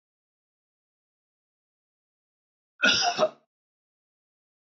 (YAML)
cough_length: 4.7 s
cough_amplitude: 12521
cough_signal_mean_std_ratio: 0.24
survey_phase: beta (2021-08-13 to 2022-03-07)
age: 65+
gender: Male
wearing_mask: 'No'
symptom_none: true
smoker_status: Ex-smoker
respiratory_condition_asthma: false
respiratory_condition_other: false
recruitment_source: REACT
submission_delay: 2 days
covid_test_result: Negative
covid_test_method: RT-qPCR
influenza_a_test_result: Negative
influenza_b_test_result: Negative